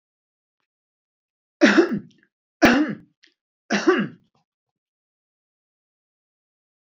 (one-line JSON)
{"three_cough_length": "6.8 s", "three_cough_amplitude": 27600, "three_cough_signal_mean_std_ratio": 0.28, "survey_phase": "beta (2021-08-13 to 2022-03-07)", "age": "65+", "gender": "Male", "wearing_mask": "No", "symptom_none": true, "smoker_status": "Ex-smoker", "respiratory_condition_asthma": false, "respiratory_condition_other": false, "recruitment_source": "REACT", "submission_delay": "2 days", "covid_test_result": "Negative", "covid_test_method": "RT-qPCR"}